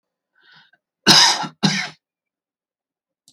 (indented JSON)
{
  "cough_length": "3.3 s",
  "cough_amplitude": 32767,
  "cough_signal_mean_std_ratio": 0.31,
  "survey_phase": "alpha (2021-03-01 to 2021-08-12)",
  "age": "45-64",
  "gender": "Male",
  "wearing_mask": "No",
  "symptom_none": true,
  "smoker_status": "Never smoked",
  "respiratory_condition_asthma": false,
  "respiratory_condition_other": false,
  "recruitment_source": "REACT",
  "submission_delay": "1 day",
  "covid_test_result": "Negative",
  "covid_test_method": "RT-qPCR"
}